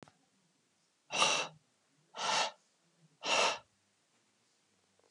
exhalation_length: 5.1 s
exhalation_amplitude: 7686
exhalation_signal_mean_std_ratio: 0.36
survey_phase: beta (2021-08-13 to 2022-03-07)
age: 45-64
gender: Male
wearing_mask: 'No'
symptom_change_to_sense_of_smell_or_taste: true
symptom_loss_of_taste: true
smoker_status: Ex-smoker
respiratory_condition_asthma: false
respiratory_condition_other: false
recruitment_source: REACT
submission_delay: 2 days
covid_test_result: Negative
covid_test_method: RT-qPCR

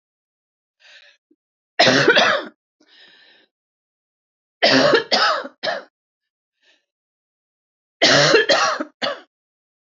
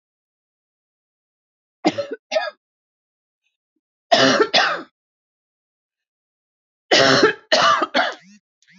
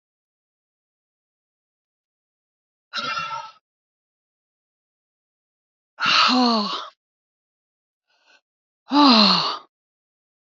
cough_length: 10.0 s
cough_amplitude: 28675
cough_signal_mean_std_ratio: 0.39
three_cough_length: 8.8 s
three_cough_amplitude: 27927
three_cough_signal_mean_std_ratio: 0.36
exhalation_length: 10.5 s
exhalation_amplitude: 32620
exhalation_signal_mean_std_ratio: 0.31
survey_phase: alpha (2021-03-01 to 2021-08-12)
age: 65+
gender: Female
wearing_mask: 'No'
symptom_cough_any: true
symptom_fatigue: true
symptom_change_to_sense_of_smell_or_taste: true
symptom_onset: 5 days
smoker_status: Never smoked
respiratory_condition_asthma: false
respiratory_condition_other: false
recruitment_source: Test and Trace
submission_delay: 2 days
covid_test_result: Positive
covid_test_method: RT-qPCR
covid_ct_value: 14.0
covid_ct_gene: N gene
covid_ct_mean: 14.1
covid_viral_load: 23000000 copies/ml
covid_viral_load_category: High viral load (>1M copies/ml)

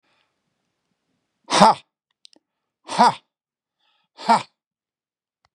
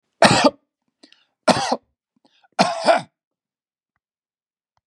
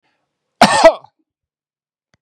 exhalation_length: 5.5 s
exhalation_amplitude: 32768
exhalation_signal_mean_std_ratio: 0.24
three_cough_length: 4.9 s
three_cough_amplitude: 32767
three_cough_signal_mean_std_ratio: 0.31
cough_length: 2.2 s
cough_amplitude: 32768
cough_signal_mean_std_ratio: 0.28
survey_phase: beta (2021-08-13 to 2022-03-07)
age: 65+
gender: Male
wearing_mask: 'No'
symptom_runny_or_blocked_nose: true
symptom_headache: true
smoker_status: Never smoked
respiratory_condition_asthma: false
respiratory_condition_other: false
recruitment_source: Test and Trace
submission_delay: 1 day
covid_test_result: Positive
covid_test_method: RT-qPCR
covid_ct_value: 18.8
covid_ct_gene: ORF1ab gene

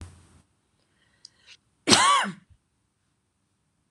cough_length: 3.9 s
cough_amplitude: 26027
cough_signal_mean_std_ratio: 0.27
survey_phase: beta (2021-08-13 to 2022-03-07)
age: 45-64
gender: Female
wearing_mask: 'No'
symptom_cough_any: true
symptom_onset: 11 days
smoker_status: Never smoked
respiratory_condition_asthma: false
respiratory_condition_other: false
recruitment_source: REACT
submission_delay: 1 day
covid_test_result: Negative
covid_test_method: RT-qPCR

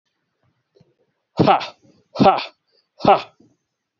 exhalation_length: 4.0 s
exhalation_amplitude: 28067
exhalation_signal_mean_std_ratio: 0.3
survey_phase: beta (2021-08-13 to 2022-03-07)
age: 45-64
gender: Male
wearing_mask: 'No'
symptom_cough_any: true
symptom_runny_or_blocked_nose: true
symptom_sore_throat: true
symptom_fatigue: true
symptom_fever_high_temperature: true
symptom_headache: true
symptom_change_to_sense_of_smell_or_taste: true
smoker_status: Ex-smoker
respiratory_condition_asthma: false
respiratory_condition_other: false
recruitment_source: Test and Trace
submission_delay: 2 days
covid_test_result: Positive
covid_test_method: LFT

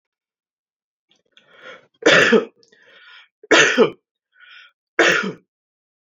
three_cough_length: 6.1 s
three_cough_amplitude: 30262
three_cough_signal_mean_std_ratio: 0.34
survey_phase: alpha (2021-03-01 to 2021-08-12)
age: 18-44
gender: Male
wearing_mask: 'No'
symptom_none: true
smoker_status: Ex-smoker
respiratory_condition_asthma: false
respiratory_condition_other: false
recruitment_source: REACT
submission_delay: 1 day
covid_test_result: Negative
covid_test_method: RT-qPCR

